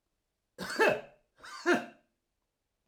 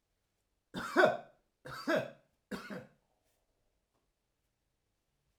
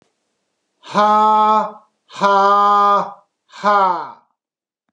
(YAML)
cough_length: 2.9 s
cough_amplitude: 6750
cough_signal_mean_std_ratio: 0.34
three_cough_length: 5.4 s
three_cough_amplitude: 7528
three_cough_signal_mean_std_ratio: 0.27
exhalation_length: 4.9 s
exhalation_amplitude: 30489
exhalation_signal_mean_std_ratio: 0.59
survey_phase: alpha (2021-03-01 to 2021-08-12)
age: 45-64
gender: Male
wearing_mask: 'No'
symptom_none: true
smoker_status: Never smoked
respiratory_condition_asthma: false
respiratory_condition_other: false
recruitment_source: REACT
submission_delay: 1 day
covid_test_result: Negative
covid_test_method: RT-qPCR